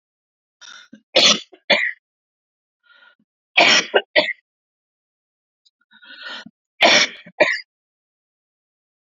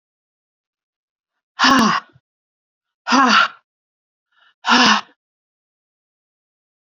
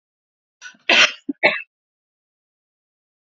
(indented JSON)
{
  "three_cough_length": "9.1 s",
  "three_cough_amplitude": 31740,
  "three_cough_signal_mean_std_ratio": 0.31,
  "exhalation_length": "6.9 s",
  "exhalation_amplitude": 30674,
  "exhalation_signal_mean_std_ratio": 0.33,
  "cough_length": "3.2 s",
  "cough_amplitude": 31964,
  "cough_signal_mean_std_ratio": 0.26,
  "survey_phase": "beta (2021-08-13 to 2022-03-07)",
  "age": "45-64",
  "gender": "Female",
  "wearing_mask": "No",
  "symptom_cough_any": true,
  "symptom_runny_or_blocked_nose": true,
  "symptom_sore_throat": true,
  "symptom_diarrhoea": true,
  "symptom_fatigue": true,
  "symptom_fever_high_temperature": true,
  "symptom_headache": true,
  "symptom_loss_of_taste": true,
  "symptom_onset": "3 days",
  "smoker_status": "Never smoked",
  "respiratory_condition_asthma": false,
  "respiratory_condition_other": false,
  "recruitment_source": "Test and Trace",
  "submission_delay": "1 day",
  "covid_test_result": "Positive",
  "covid_test_method": "RT-qPCR",
  "covid_ct_value": 16.1,
  "covid_ct_gene": "ORF1ab gene",
  "covid_ct_mean": 17.1,
  "covid_viral_load": "2500000 copies/ml",
  "covid_viral_load_category": "High viral load (>1M copies/ml)"
}